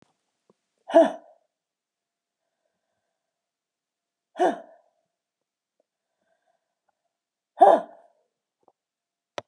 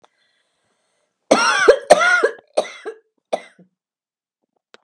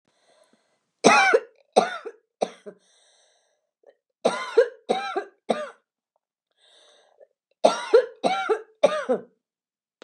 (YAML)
exhalation_length: 9.5 s
exhalation_amplitude: 24432
exhalation_signal_mean_std_ratio: 0.18
cough_length: 4.8 s
cough_amplitude: 32768
cough_signal_mean_std_ratio: 0.34
three_cough_length: 10.0 s
three_cough_amplitude: 29873
three_cough_signal_mean_std_ratio: 0.34
survey_phase: beta (2021-08-13 to 2022-03-07)
age: 65+
gender: Female
wearing_mask: 'No'
symptom_cough_any: true
symptom_runny_or_blocked_nose: true
symptom_shortness_of_breath: true
symptom_sore_throat: true
symptom_abdominal_pain: true
symptom_fatigue: true
symptom_fever_high_temperature: true
symptom_headache: true
symptom_other: true
symptom_onset: 12 days
smoker_status: Ex-smoker
respiratory_condition_asthma: false
respiratory_condition_other: false
recruitment_source: REACT
submission_delay: 1 day
covid_test_result: Negative
covid_test_method: RT-qPCR
influenza_a_test_result: Negative
influenza_b_test_result: Negative